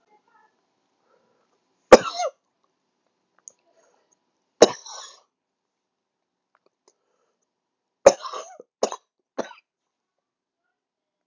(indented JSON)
{
  "three_cough_length": "11.3 s",
  "three_cough_amplitude": 32768,
  "three_cough_signal_mean_std_ratio": 0.13,
  "survey_phase": "beta (2021-08-13 to 2022-03-07)",
  "age": "18-44",
  "gender": "Male",
  "wearing_mask": "No",
  "symptom_cough_any": true,
  "symptom_runny_or_blocked_nose": true,
  "symptom_diarrhoea": true,
  "symptom_fatigue": true,
  "symptom_fever_high_temperature": true,
  "symptom_headache": true,
  "symptom_change_to_sense_of_smell_or_taste": true,
  "symptom_loss_of_taste": true,
  "smoker_status": "Ex-smoker",
  "recruitment_source": "Test and Trace",
  "submission_delay": "2 days",
  "covid_test_result": "Positive",
  "covid_test_method": "RT-qPCR",
  "covid_ct_value": 21.2,
  "covid_ct_gene": "ORF1ab gene"
}